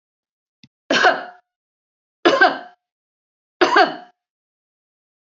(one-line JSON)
{"three_cough_length": "5.4 s", "three_cough_amplitude": 29399, "three_cough_signal_mean_std_ratio": 0.31, "survey_phase": "beta (2021-08-13 to 2022-03-07)", "age": "45-64", "gender": "Female", "wearing_mask": "No", "symptom_runny_or_blocked_nose": true, "symptom_sore_throat": true, "symptom_headache": true, "smoker_status": "Never smoked", "respiratory_condition_asthma": false, "respiratory_condition_other": false, "recruitment_source": "REACT", "submission_delay": "2 days", "covid_test_result": "Negative", "covid_test_method": "RT-qPCR", "influenza_a_test_result": "Negative", "influenza_b_test_result": "Negative"}